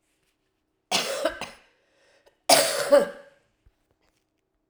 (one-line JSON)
{"cough_length": "4.7 s", "cough_amplitude": 25896, "cough_signal_mean_std_ratio": 0.32, "survey_phase": "alpha (2021-03-01 to 2021-08-12)", "age": "65+", "gender": "Female", "wearing_mask": "No", "symptom_cough_any": true, "symptom_onset": "3 days", "smoker_status": "Never smoked", "respiratory_condition_asthma": false, "respiratory_condition_other": false, "recruitment_source": "Test and Trace", "submission_delay": "2 days", "covid_test_result": "Positive", "covid_test_method": "RT-qPCR", "covid_ct_value": 23.3, "covid_ct_gene": "N gene", "covid_ct_mean": 23.4, "covid_viral_load": "21000 copies/ml", "covid_viral_load_category": "Low viral load (10K-1M copies/ml)"}